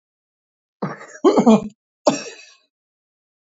{
  "cough_length": "3.5 s",
  "cough_amplitude": 30818,
  "cough_signal_mean_std_ratio": 0.31,
  "survey_phase": "beta (2021-08-13 to 2022-03-07)",
  "age": "65+",
  "gender": "Male",
  "wearing_mask": "No",
  "symptom_none": true,
  "smoker_status": "Never smoked",
  "respiratory_condition_asthma": false,
  "respiratory_condition_other": false,
  "recruitment_source": "REACT",
  "submission_delay": "2 days",
  "covid_test_result": "Negative",
  "covid_test_method": "RT-qPCR",
  "influenza_a_test_result": "Negative",
  "influenza_b_test_result": "Negative"
}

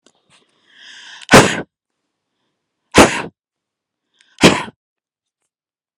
{
  "exhalation_length": "6.0 s",
  "exhalation_amplitude": 32768,
  "exhalation_signal_mean_std_ratio": 0.25,
  "survey_phase": "alpha (2021-03-01 to 2021-08-12)",
  "age": "18-44",
  "gender": "Female",
  "wearing_mask": "No",
  "symptom_none": true,
  "smoker_status": "Never smoked",
  "respiratory_condition_asthma": true,
  "respiratory_condition_other": false,
  "recruitment_source": "REACT",
  "submission_delay": "3 days",
  "covid_test_result": "Negative",
  "covid_test_method": "RT-qPCR"
}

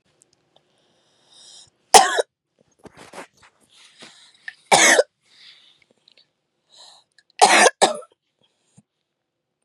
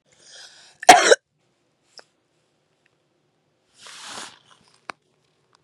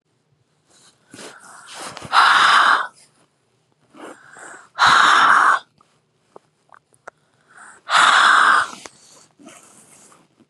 {
  "three_cough_length": "9.6 s",
  "three_cough_amplitude": 32768,
  "three_cough_signal_mean_std_ratio": 0.25,
  "cough_length": "5.6 s",
  "cough_amplitude": 32768,
  "cough_signal_mean_std_ratio": 0.17,
  "exhalation_length": "10.5 s",
  "exhalation_amplitude": 30979,
  "exhalation_signal_mean_std_ratio": 0.42,
  "survey_phase": "beta (2021-08-13 to 2022-03-07)",
  "age": "45-64",
  "gender": "Female",
  "wearing_mask": "No",
  "symptom_cough_any": true,
  "smoker_status": "Never smoked",
  "respiratory_condition_asthma": true,
  "respiratory_condition_other": false,
  "recruitment_source": "REACT",
  "submission_delay": "2 days",
  "covid_test_result": "Negative",
  "covid_test_method": "RT-qPCR",
  "influenza_a_test_result": "Negative",
  "influenza_b_test_result": "Negative"
}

